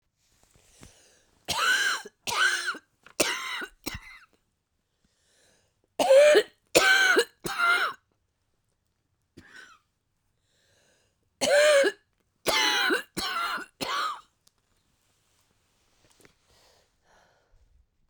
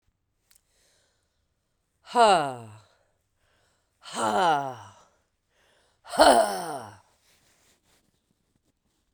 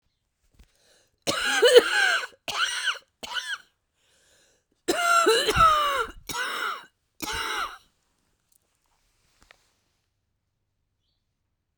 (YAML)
three_cough_length: 18.1 s
three_cough_amplitude: 23025
three_cough_signal_mean_std_ratio: 0.39
exhalation_length: 9.1 s
exhalation_amplitude: 23271
exhalation_signal_mean_std_ratio: 0.3
cough_length: 11.8 s
cough_amplitude: 27978
cough_signal_mean_std_ratio: 0.41
survey_phase: beta (2021-08-13 to 2022-03-07)
age: 45-64
gender: Female
wearing_mask: 'No'
symptom_cough_any: true
symptom_runny_or_blocked_nose: true
symptom_shortness_of_breath: true
symptom_sore_throat: true
symptom_fatigue: true
symptom_headache: true
symptom_change_to_sense_of_smell_or_taste: true
symptom_other: true
symptom_onset: 3 days
smoker_status: Never smoked
respiratory_condition_asthma: true
respiratory_condition_other: false
recruitment_source: Test and Trace
submission_delay: 1 day
covid_test_result: Positive
covid_test_method: RT-qPCR
covid_ct_value: 16.9
covid_ct_gene: N gene